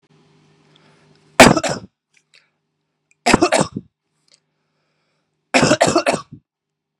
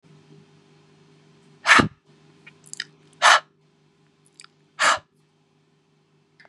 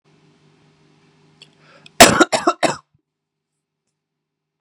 three_cough_length: 7.0 s
three_cough_amplitude: 32768
three_cough_signal_mean_std_ratio: 0.3
exhalation_length: 6.5 s
exhalation_amplitude: 29722
exhalation_signal_mean_std_ratio: 0.24
cough_length: 4.6 s
cough_amplitude: 32768
cough_signal_mean_std_ratio: 0.22
survey_phase: beta (2021-08-13 to 2022-03-07)
age: 18-44
gender: Male
wearing_mask: 'No'
symptom_cough_any: true
symptom_runny_or_blocked_nose: true
symptom_sore_throat: true
symptom_headache: true
symptom_onset: 3 days
smoker_status: Never smoked
respiratory_condition_asthma: false
respiratory_condition_other: false
recruitment_source: Test and Trace
submission_delay: 2 days
covid_test_result: Positive
covid_test_method: RT-qPCR
covid_ct_value: 19.4
covid_ct_gene: ORF1ab gene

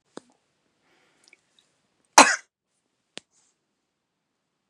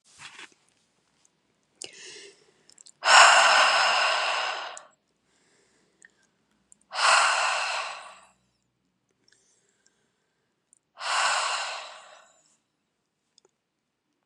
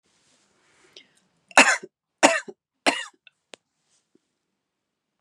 cough_length: 4.7 s
cough_amplitude: 32768
cough_signal_mean_std_ratio: 0.13
exhalation_length: 14.3 s
exhalation_amplitude: 28299
exhalation_signal_mean_std_ratio: 0.36
three_cough_length: 5.2 s
three_cough_amplitude: 31619
three_cough_signal_mean_std_ratio: 0.21
survey_phase: beta (2021-08-13 to 2022-03-07)
age: 18-44
gender: Female
wearing_mask: 'No'
symptom_none: true
smoker_status: Ex-smoker
respiratory_condition_asthma: false
respiratory_condition_other: false
recruitment_source: Test and Trace
submission_delay: 2 days
covid_test_result: Negative
covid_test_method: RT-qPCR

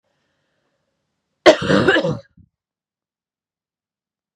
cough_length: 4.4 s
cough_amplitude: 32768
cough_signal_mean_std_ratio: 0.27
survey_phase: beta (2021-08-13 to 2022-03-07)
age: 45-64
gender: Female
wearing_mask: 'No'
symptom_shortness_of_breath: true
symptom_sore_throat: true
symptom_fatigue: true
symptom_headache: true
smoker_status: Never smoked
respiratory_condition_asthma: false
respiratory_condition_other: false
recruitment_source: Test and Trace
submission_delay: 2 days
covid_test_result: Positive
covid_test_method: RT-qPCR
covid_ct_value: 20.2
covid_ct_gene: ORF1ab gene
covid_ct_mean: 20.7
covid_viral_load: 160000 copies/ml
covid_viral_load_category: Low viral load (10K-1M copies/ml)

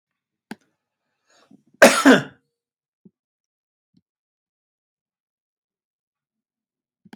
cough_length: 7.2 s
cough_amplitude: 32767
cough_signal_mean_std_ratio: 0.16
survey_phase: beta (2021-08-13 to 2022-03-07)
age: 65+
gender: Male
wearing_mask: 'No'
symptom_none: true
smoker_status: Ex-smoker
respiratory_condition_asthma: false
respiratory_condition_other: false
recruitment_source: REACT
submission_delay: 2 days
covid_test_result: Negative
covid_test_method: RT-qPCR
influenza_a_test_result: Negative
influenza_b_test_result: Negative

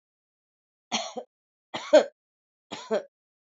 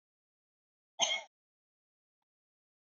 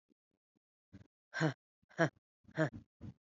three_cough_length: 3.6 s
three_cough_amplitude: 18903
three_cough_signal_mean_std_ratio: 0.23
cough_length: 2.9 s
cough_amplitude: 6436
cough_signal_mean_std_ratio: 0.2
exhalation_length: 3.2 s
exhalation_amplitude: 5640
exhalation_signal_mean_std_ratio: 0.27
survey_phase: beta (2021-08-13 to 2022-03-07)
age: 18-44
gender: Female
wearing_mask: 'No'
symptom_cough_any: true
symptom_new_continuous_cough: true
symptom_runny_or_blocked_nose: true
symptom_shortness_of_breath: true
symptom_sore_throat: true
symptom_fatigue: true
symptom_headache: true
symptom_other: true
smoker_status: Ex-smoker
respiratory_condition_asthma: true
respiratory_condition_other: false
recruitment_source: Test and Trace
submission_delay: 1 day
covid_test_result: Positive
covid_test_method: RT-qPCR
covid_ct_value: 14.9
covid_ct_gene: ORF1ab gene
covid_ct_mean: 15.1
covid_viral_load: 11000000 copies/ml
covid_viral_load_category: High viral load (>1M copies/ml)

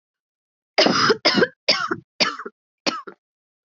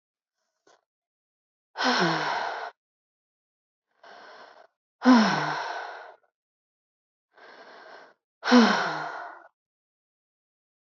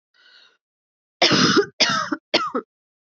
three_cough_length: 3.7 s
three_cough_amplitude: 25556
three_cough_signal_mean_std_ratio: 0.43
exhalation_length: 10.8 s
exhalation_amplitude: 16344
exhalation_signal_mean_std_ratio: 0.34
cough_length: 3.2 s
cough_amplitude: 25443
cough_signal_mean_std_ratio: 0.44
survey_phase: beta (2021-08-13 to 2022-03-07)
age: 45-64
gender: Female
wearing_mask: 'No'
symptom_cough_any: true
symptom_runny_or_blocked_nose: true
symptom_shortness_of_breath: true
symptom_fatigue: true
symptom_fever_high_temperature: true
symptom_headache: true
smoker_status: Ex-smoker
respiratory_condition_asthma: false
respiratory_condition_other: false
recruitment_source: REACT
submission_delay: 1 day
covid_test_result: Positive
covid_test_method: RT-qPCR
covid_ct_value: 27.0
covid_ct_gene: E gene
influenza_a_test_result: Negative
influenza_b_test_result: Negative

